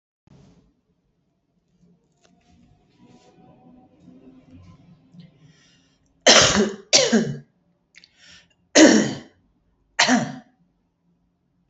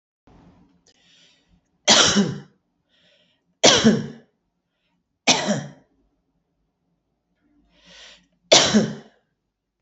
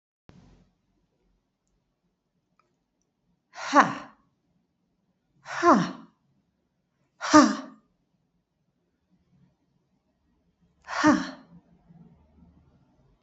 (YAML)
cough_length: 11.7 s
cough_amplitude: 32463
cough_signal_mean_std_ratio: 0.28
three_cough_length: 9.8 s
three_cough_amplitude: 32767
three_cough_signal_mean_std_ratio: 0.31
exhalation_length: 13.2 s
exhalation_amplitude: 26809
exhalation_signal_mean_std_ratio: 0.22
survey_phase: beta (2021-08-13 to 2022-03-07)
age: 45-64
gender: Female
wearing_mask: 'No'
symptom_cough_any: true
symptom_runny_or_blocked_nose: true
symptom_sore_throat: true
symptom_fatigue: true
symptom_fever_high_temperature: true
symptom_headache: true
symptom_change_to_sense_of_smell_or_taste: true
symptom_other: true
symptom_onset: 7 days
smoker_status: Ex-smoker
respiratory_condition_asthma: false
respiratory_condition_other: false
recruitment_source: Test and Trace
submission_delay: 1 day
covid_test_result: Positive
covid_test_method: ePCR